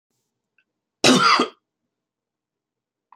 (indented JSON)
{
  "cough_length": "3.2 s",
  "cough_amplitude": 26959,
  "cough_signal_mean_std_ratio": 0.29,
  "survey_phase": "alpha (2021-03-01 to 2021-08-12)",
  "age": "45-64",
  "gender": "Male",
  "wearing_mask": "No",
  "symptom_none": true,
  "smoker_status": "Ex-smoker",
  "respiratory_condition_asthma": true,
  "respiratory_condition_other": false,
  "recruitment_source": "REACT",
  "submission_delay": "2 days",
  "covid_test_result": "Negative",
  "covid_test_method": "RT-qPCR"
}